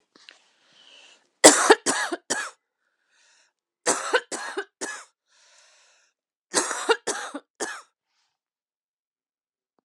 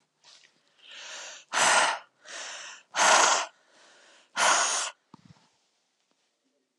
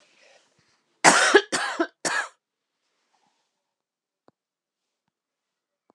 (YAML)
three_cough_length: 9.8 s
three_cough_amplitude: 32768
three_cough_signal_mean_std_ratio: 0.27
exhalation_length: 6.8 s
exhalation_amplitude: 13691
exhalation_signal_mean_std_ratio: 0.41
cough_length: 5.9 s
cough_amplitude: 31303
cough_signal_mean_std_ratio: 0.26
survey_phase: alpha (2021-03-01 to 2021-08-12)
age: 18-44
gender: Female
wearing_mask: 'Yes'
symptom_cough_any: true
symptom_abdominal_pain: true
symptom_onset: 2 days
smoker_status: Ex-smoker
respiratory_condition_asthma: false
respiratory_condition_other: false
recruitment_source: Test and Trace
submission_delay: 1 day
covid_ct_value: 33.8
covid_ct_gene: ORF1ab gene